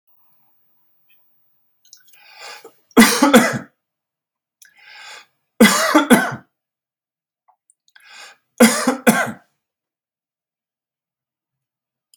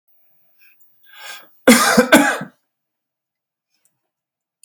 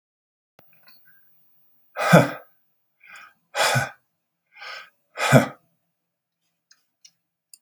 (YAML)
three_cough_length: 12.2 s
three_cough_amplitude: 32768
three_cough_signal_mean_std_ratio: 0.29
cough_length: 4.6 s
cough_amplitude: 32768
cough_signal_mean_std_ratio: 0.3
exhalation_length: 7.6 s
exhalation_amplitude: 32768
exhalation_signal_mean_std_ratio: 0.25
survey_phase: beta (2021-08-13 to 2022-03-07)
age: 65+
gender: Male
wearing_mask: 'No'
symptom_none: true
smoker_status: Never smoked
respiratory_condition_asthma: false
respiratory_condition_other: false
recruitment_source: REACT
submission_delay: 1 day
covid_test_result: Negative
covid_test_method: RT-qPCR
influenza_a_test_result: Negative
influenza_b_test_result: Negative